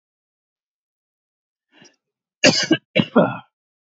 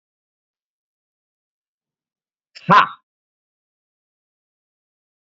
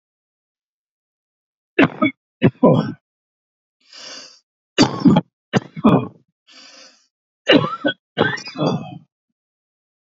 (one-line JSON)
{"cough_length": "3.8 s", "cough_amplitude": 31497, "cough_signal_mean_std_ratio": 0.28, "exhalation_length": "5.4 s", "exhalation_amplitude": 27785, "exhalation_signal_mean_std_ratio": 0.15, "three_cough_length": "10.2 s", "three_cough_amplitude": 32749, "three_cough_signal_mean_std_ratio": 0.34, "survey_phase": "beta (2021-08-13 to 2022-03-07)", "age": "45-64", "gender": "Male", "wearing_mask": "No", "symptom_runny_or_blocked_nose": true, "symptom_sore_throat": true, "symptom_fatigue": true, "symptom_onset": "12 days", "smoker_status": "Never smoked", "respiratory_condition_asthma": true, "respiratory_condition_other": false, "recruitment_source": "REACT", "submission_delay": "1 day", "covid_test_result": "Negative", "covid_test_method": "RT-qPCR"}